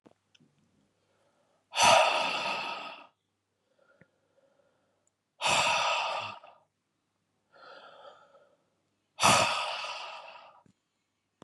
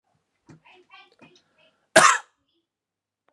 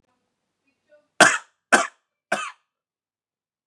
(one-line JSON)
{"exhalation_length": "11.4 s", "exhalation_amplitude": 14708, "exhalation_signal_mean_std_ratio": 0.37, "cough_length": "3.3 s", "cough_amplitude": 32500, "cough_signal_mean_std_ratio": 0.2, "three_cough_length": "3.7 s", "three_cough_amplitude": 32767, "three_cough_signal_mean_std_ratio": 0.23, "survey_phase": "beta (2021-08-13 to 2022-03-07)", "age": "18-44", "gender": "Male", "wearing_mask": "No", "symptom_cough_any": true, "symptom_runny_or_blocked_nose": true, "symptom_sore_throat": true, "symptom_fatigue": true, "symptom_fever_high_temperature": true, "symptom_change_to_sense_of_smell_or_taste": true, "symptom_loss_of_taste": true, "symptom_onset": "4 days", "smoker_status": "Never smoked", "respiratory_condition_asthma": false, "respiratory_condition_other": false, "recruitment_source": "Test and Trace", "submission_delay": "2 days", "covid_test_result": "Positive", "covid_test_method": "ePCR"}